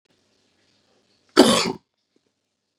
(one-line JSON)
{"cough_length": "2.8 s", "cough_amplitude": 32737, "cough_signal_mean_std_ratio": 0.24, "survey_phase": "beta (2021-08-13 to 2022-03-07)", "age": "45-64", "gender": "Male", "wearing_mask": "No", "symptom_none": true, "smoker_status": "Never smoked", "respiratory_condition_asthma": false, "respiratory_condition_other": false, "recruitment_source": "REACT", "submission_delay": "2 days", "covid_test_result": "Negative", "covid_test_method": "RT-qPCR", "influenza_a_test_result": "Negative", "influenza_b_test_result": "Negative"}